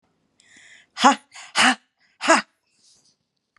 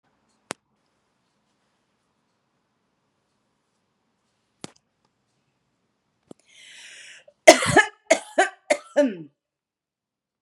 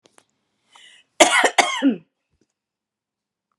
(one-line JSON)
{"exhalation_length": "3.6 s", "exhalation_amplitude": 32479, "exhalation_signal_mean_std_ratio": 0.29, "three_cough_length": "10.4 s", "three_cough_amplitude": 32768, "three_cough_signal_mean_std_ratio": 0.18, "cough_length": "3.6 s", "cough_amplitude": 32767, "cough_signal_mean_std_ratio": 0.3, "survey_phase": "beta (2021-08-13 to 2022-03-07)", "age": "45-64", "gender": "Female", "wearing_mask": "No", "symptom_none": true, "smoker_status": "Never smoked", "respiratory_condition_asthma": false, "respiratory_condition_other": false, "recruitment_source": "REACT", "submission_delay": "3 days", "covid_test_result": "Negative", "covid_test_method": "RT-qPCR", "influenza_a_test_result": "Negative", "influenza_b_test_result": "Negative"}